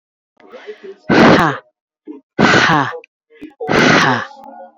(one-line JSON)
{"exhalation_length": "4.8 s", "exhalation_amplitude": 30080, "exhalation_signal_mean_std_ratio": 0.51, "survey_phase": "beta (2021-08-13 to 2022-03-07)", "age": "45-64", "gender": "Female", "wearing_mask": "No", "symptom_none": true, "smoker_status": "Ex-smoker", "respiratory_condition_asthma": false, "respiratory_condition_other": false, "recruitment_source": "REACT", "submission_delay": "2 days", "covid_test_result": "Negative", "covid_test_method": "RT-qPCR", "influenza_a_test_result": "Negative", "influenza_b_test_result": "Negative"}